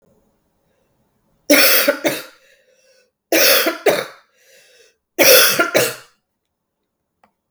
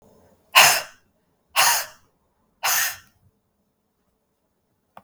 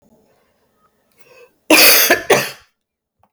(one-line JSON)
{"three_cough_length": "7.5 s", "three_cough_amplitude": 32768, "three_cough_signal_mean_std_ratio": 0.4, "exhalation_length": "5.0 s", "exhalation_amplitude": 32768, "exhalation_signal_mean_std_ratio": 0.3, "cough_length": "3.3 s", "cough_amplitude": 32768, "cough_signal_mean_std_ratio": 0.37, "survey_phase": "beta (2021-08-13 to 2022-03-07)", "age": "18-44", "gender": "Female", "wearing_mask": "No", "symptom_cough_any": true, "symptom_sore_throat": true, "symptom_fatigue": true, "symptom_fever_high_temperature": true, "symptom_headache": true, "smoker_status": "Never smoked", "respiratory_condition_asthma": false, "respiratory_condition_other": false, "recruitment_source": "Test and Trace", "submission_delay": "2 days", "covid_test_result": "Positive", "covid_test_method": "RT-qPCR", "covid_ct_value": 22.2, "covid_ct_gene": "ORF1ab gene", "covid_ct_mean": 22.8, "covid_viral_load": "33000 copies/ml", "covid_viral_load_category": "Low viral load (10K-1M copies/ml)"}